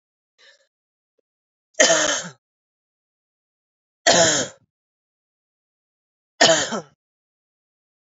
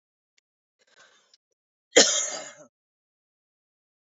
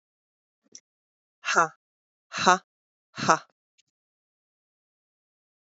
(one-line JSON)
{"three_cough_length": "8.2 s", "three_cough_amplitude": 29962, "three_cough_signal_mean_std_ratio": 0.29, "cough_length": "4.1 s", "cough_amplitude": 25885, "cough_signal_mean_std_ratio": 0.2, "exhalation_length": "5.7 s", "exhalation_amplitude": 26909, "exhalation_signal_mean_std_ratio": 0.2, "survey_phase": "alpha (2021-03-01 to 2021-08-12)", "age": "18-44", "gender": "Female", "wearing_mask": "No", "symptom_cough_any": true, "symptom_fatigue": true, "symptom_headache": true, "symptom_change_to_sense_of_smell_or_taste": true, "symptom_loss_of_taste": true, "smoker_status": "Never smoked", "respiratory_condition_asthma": false, "respiratory_condition_other": false, "recruitment_source": "Test and Trace", "submission_delay": "1 day", "covid_test_result": "Positive", "covid_test_method": "LFT"}